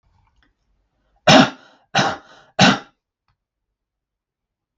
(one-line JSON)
{"three_cough_length": "4.8 s", "three_cough_amplitude": 32768, "three_cough_signal_mean_std_ratio": 0.27, "survey_phase": "beta (2021-08-13 to 2022-03-07)", "age": "45-64", "gender": "Male", "wearing_mask": "No", "symptom_sore_throat": true, "symptom_abdominal_pain": true, "symptom_fatigue": true, "symptom_onset": "12 days", "smoker_status": "Never smoked", "respiratory_condition_asthma": false, "respiratory_condition_other": false, "recruitment_source": "REACT", "submission_delay": "0 days", "covid_test_result": "Negative", "covid_test_method": "RT-qPCR"}